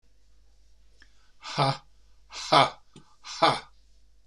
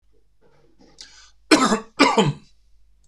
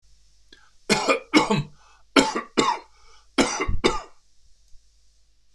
exhalation_length: 4.3 s
exhalation_amplitude: 19860
exhalation_signal_mean_std_ratio: 0.33
cough_length: 3.1 s
cough_amplitude: 26028
cough_signal_mean_std_ratio: 0.36
three_cough_length: 5.5 s
three_cough_amplitude: 25133
three_cough_signal_mean_std_ratio: 0.43
survey_phase: beta (2021-08-13 to 2022-03-07)
age: 65+
gender: Male
wearing_mask: 'No'
symptom_none: true
smoker_status: Ex-smoker
respiratory_condition_asthma: false
respiratory_condition_other: false
recruitment_source: REACT
submission_delay: 1 day
covid_test_result: Negative
covid_test_method: RT-qPCR
influenza_a_test_result: Unknown/Void
influenza_b_test_result: Unknown/Void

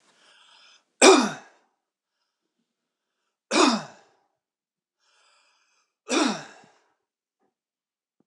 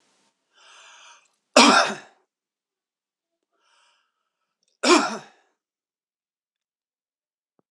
three_cough_length: 8.3 s
three_cough_amplitude: 26006
three_cough_signal_mean_std_ratio: 0.23
cough_length: 7.7 s
cough_amplitude: 26028
cough_signal_mean_std_ratio: 0.22
survey_phase: alpha (2021-03-01 to 2021-08-12)
age: 45-64
gender: Male
wearing_mask: 'No'
symptom_shortness_of_breath: true
symptom_diarrhoea: true
symptom_fatigue: true
symptom_headache: true
symptom_change_to_sense_of_smell_or_taste: true
symptom_loss_of_taste: true
symptom_onset: 2 days
smoker_status: Never smoked
respiratory_condition_asthma: true
respiratory_condition_other: false
recruitment_source: Test and Trace
submission_delay: 2 days
covid_test_result: Positive
covid_test_method: RT-qPCR
covid_ct_value: 17.8
covid_ct_gene: N gene
covid_ct_mean: 17.8
covid_viral_load: 1400000 copies/ml
covid_viral_load_category: High viral load (>1M copies/ml)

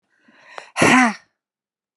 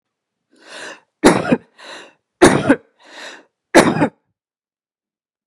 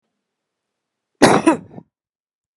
exhalation_length: 2.0 s
exhalation_amplitude: 28867
exhalation_signal_mean_std_ratio: 0.35
three_cough_length: 5.5 s
three_cough_amplitude: 32768
three_cough_signal_mean_std_ratio: 0.32
cough_length: 2.6 s
cough_amplitude: 32768
cough_signal_mean_std_ratio: 0.26
survey_phase: beta (2021-08-13 to 2022-03-07)
age: 45-64
gender: Female
wearing_mask: 'No'
symptom_none: true
smoker_status: Never smoked
respiratory_condition_asthma: false
respiratory_condition_other: false
recruitment_source: REACT
submission_delay: 1 day
covid_test_result: Negative
covid_test_method: RT-qPCR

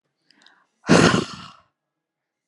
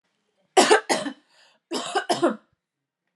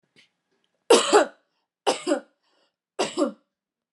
exhalation_length: 2.5 s
exhalation_amplitude: 29633
exhalation_signal_mean_std_ratio: 0.3
cough_length: 3.2 s
cough_amplitude: 25542
cough_signal_mean_std_ratio: 0.38
three_cough_length: 3.9 s
three_cough_amplitude: 24346
three_cough_signal_mean_std_ratio: 0.33
survey_phase: alpha (2021-03-01 to 2021-08-12)
age: 18-44
gender: Female
wearing_mask: 'No'
symptom_none: true
smoker_status: Never smoked
respiratory_condition_asthma: false
respiratory_condition_other: false
recruitment_source: REACT
submission_delay: 1 day
covid_test_result: Negative
covid_test_method: RT-qPCR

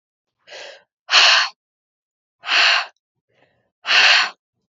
exhalation_length: 4.8 s
exhalation_amplitude: 32768
exhalation_signal_mean_std_ratio: 0.41
survey_phase: beta (2021-08-13 to 2022-03-07)
age: 18-44
gender: Female
wearing_mask: 'No'
symptom_cough_any: true
symptom_runny_or_blocked_nose: true
symptom_other: true
symptom_onset: 5 days
smoker_status: Never smoked
respiratory_condition_asthma: true
respiratory_condition_other: false
recruitment_source: Test and Trace
submission_delay: 2 days
covid_test_result: Negative
covid_test_method: RT-qPCR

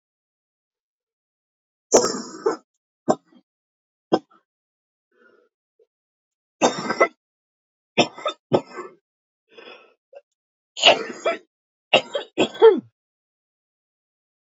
three_cough_length: 14.5 s
three_cough_amplitude: 30657
three_cough_signal_mean_std_ratio: 0.25
survey_phase: beta (2021-08-13 to 2022-03-07)
age: 65+
gender: Female
wearing_mask: 'No'
symptom_cough_any: true
symptom_fatigue: true
smoker_status: Ex-smoker
respiratory_condition_asthma: true
respiratory_condition_other: true
recruitment_source: REACT
submission_delay: 1 day
covid_test_result: Negative
covid_test_method: RT-qPCR
influenza_a_test_result: Negative
influenza_b_test_result: Negative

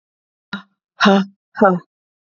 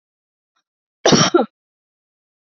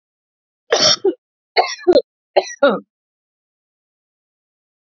exhalation_length: 2.4 s
exhalation_amplitude: 29069
exhalation_signal_mean_std_ratio: 0.35
cough_length: 2.5 s
cough_amplitude: 28376
cough_signal_mean_std_ratio: 0.29
three_cough_length: 4.9 s
three_cough_amplitude: 31457
three_cough_signal_mean_std_ratio: 0.32
survey_phase: beta (2021-08-13 to 2022-03-07)
age: 45-64
gender: Female
wearing_mask: 'No'
symptom_none: true
smoker_status: Never smoked
respiratory_condition_asthma: false
respiratory_condition_other: false
recruitment_source: REACT
submission_delay: 8 days
covid_test_result: Negative
covid_test_method: RT-qPCR
influenza_a_test_result: Negative
influenza_b_test_result: Negative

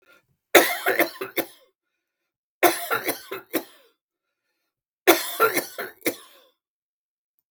three_cough_length: 7.5 s
three_cough_amplitude: 32768
three_cough_signal_mean_std_ratio: 0.33
survey_phase: beta (2021-08-13 to 2022-03-07)
age: 45-64
gender: Male
wearing_mask: 'No'
symptom_none: true
smoker_status: Ex-smoker
respiratory_condition_asthma: true
respiratory_condition_other: false
recruitment_source: REACT
submission_delay: 2 days
covid_test_result: Negative
covid_test_method: RT-qPCR
influenza_a_test_result: Negative
influenza_b_test_result: Negative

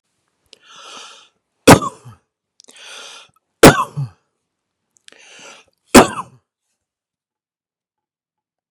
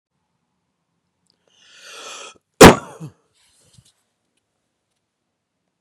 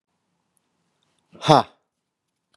three_cough_length: 8.7 s
three_cough_amplitude: 32768
three_cough_signal_mean_std_ratio: 0.2
cough_length: 5.8 s
cough_amplitude: 32768
cough_signal_mean_std_ratio: 0.15
exhalation_length: 2.6 s
exhalation_amplitude: 32767
exhalation_signal_mean_std_ratio: 0.17
survey_phase: beta (2021-08-13 to 2022-03-07)
age: 45-64
gender: Male
wearing_mask: 'No'
symptom_none: true
smoker_status: Never smoked
respiratory_condition_asthma: false
respiratory_condition_other: false
recruitment_source: REACT
submission_delay: 1 day
covid_test_result: Negative
covid_test_method: RT-qPCR
influenza_a_test_result: Negative
influenza_b_test_result: Negative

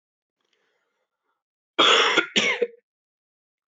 cough_length: 3.8 s
cough_amplitude: 22568
cough_signal_mean_std_ratio: 0.35
survey_phase: alpha (2021-03-01 to 2021-08-12)
age: 18-44
gender: Male
wearing_mask: 'No'
symptom_cough_any: true
symptom_fatigue: true
symptom_headache: true
symptom_change_to_sense_of_smell_or_taste: true
symptom_onset: 4 days
smoker_status: Never smoked
respiratory_condition_asthma: false
respiratory_condition_other: false
recruitment_source: Test and Trace
submission_delay: 1 day
covid_test_result: Positive
covid_test_method: RT-qPCR
covid_ct_value: 15.0
covid_ct_gene: ORF1ab gene
covid_ct_mean: 15.4
covid_viral_load: 8700000 copies/ml
covid_viral_load_category: High viral load (>1M copies/ml)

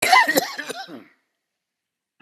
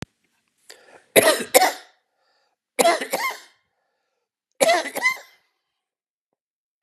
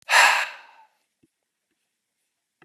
cough_length: 2.2 s
cough_amplitude: 27514
cough_signal_mean_std_ratio: 0.37
three_cough_length: 6.8 s
three_cough_amplitude: 32768
three_cough_signal_mean_std_ratio: 0.33
exhalation_length: 2.6 s
exhalation_amplitude: 24454
exhalation_signal_mean_std_ratio: 0.29
survey_phase: beta (2021-08-13 to 2022-03-07)
age: 45-64
gender: Male
wearing_mask: 'No'
symptom_headache: true
symptom_onset: 12 days
smoker_status: Never smoked
respiratory_condition_asthma: false
respiratory_condition_other: false
recruitment_source: REACT
submission_delay: 2 days
covid_test_result: Negative
covid_test_method: RT-qPCR
influenza_a_test_result: Negative
influenza_b_test_result: Negative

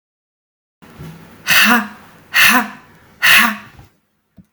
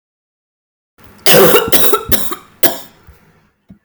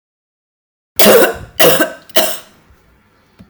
exhalation_length: 4.5 s
exhalation_amplitude: 32768
exhalation_signal_mean_std_ratio: 0.42
cough_length: 3.8 s
cough_amplitude: 32768
cough_signal_mean_std_ratio: 0.45
three_cough_length: 3.5 s
three_cough_amplitude: 32768
three_cough_signal_mean_std_ratio: 0.42
survey_phase: beta (2021-08-13 to 2022-03-07)
age: 45-64
gender: Female
wearing_mask: 'No'
symptom_cough_any: true
symptom_runny_or_blocked_nose: true
symptom_shortness_of_breath: true
symptom_sore_throat: true
symptom_fatigue: true
symptom_headache: true
smoker_status: Never smoked
respiratory_condition_asthma: false
respiratory_condition_other: false
recruitment_source: Test and Trace
submission_delay: 3 days
covid_test_result: Positive
covid_test_method: RT-qPCR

